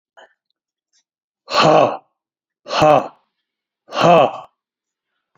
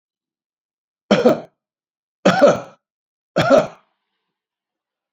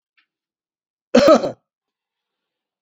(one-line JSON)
{"exhalation_length": "5.4 s", "exhalation_amplitude": 29016, "exhalation_signal_mean_std_ratio": 0.36, "three_cough_length": "5.1 s", "three_cough_amplitude": 28730, "three_cough_signal_mean_std_ratio": 0.32, "cough_length": "2.8 s", "cough_amplitude": 32207, "cough_signal_mean_std_ratio": 0.27, "survey_phase": "beta (2021-08-13 to 2022-03-07)", "age": "65+", "gender": "Male", "wearing_mask": "No", "symptom_none": true, "smoker_status": "Ex-smoker", "respiratory_condition_asthma": false, "respiratory_condition_other": false, "recruitment_source": "REACT", "submission_delay": "2 days", "covid_test_result": "Negative", "covid_test_method": "RT-qPCR", "influenza_a_test_result": "Unknown/Void", "influenza_b_test_result": "Unknown/Void"}